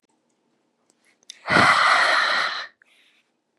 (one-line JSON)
{"exhalation_length": "3.6 s", "exhalation_amplitude": 20800, "exhalation_signal_mean_std_ratio": 0.47, "survey_phase": "beta (2021-08-13 to 2022-03-07)", "age": "18-44", "gender": "Female", "wearing_mask": "No", "symptom_none": true, "smoker_status": "Current smoker (1 to 10 cigarettes per day)", "respiratory_condition_asthma": false, "respiratory_condition_other": false, "recruitment_source": "REACT", "submission_delay": "2 days", "covid_test_result": "Negative", "covid_test_method": "RT-qPCR", "influenza_a_test_result": "Negative", "influenza_b_test_result": "Negative"}